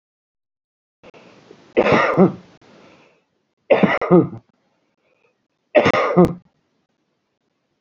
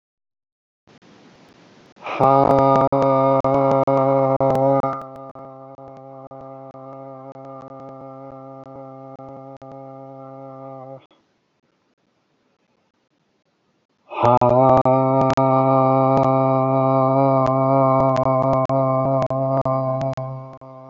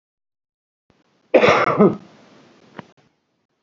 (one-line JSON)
{"three_cough_length": "7.8 s", "three_cough_amplitude": 29476, "three_cough_signal_mean_std_ratio": 0.34, "exhalation_length": "20.9 s", "exhalation_amplitude": 27591, "exhalation_signal_mean_std_ratio": 0.57, "cough_length": "3.6 s", "cough_amplitude": 31501, "cough_signal_mean_std_ratio": 0.31, "survey_phase": "beta (2021-08-13 to 2022-03-07)", "age": "65+", "gender": "Male", "wearing_mask": "No", "symptom_cough_any": true, "symptom_runny_or_blocked_nose": true, "symptom_fatigue": true, "symptom_onset": "13 days", "smoker_status": "Ex-smoker", "respiratory_condition_asthma": false, "respiratory_condition_other": false, "recruitment_source": "REACT", "submission_delay": "1 day", "covid_test_result": "Negative", "covid_test_method": "RT-qPCR", "influenza_a_test_result": "Negative", "influenza_b_test_result": "Negative"}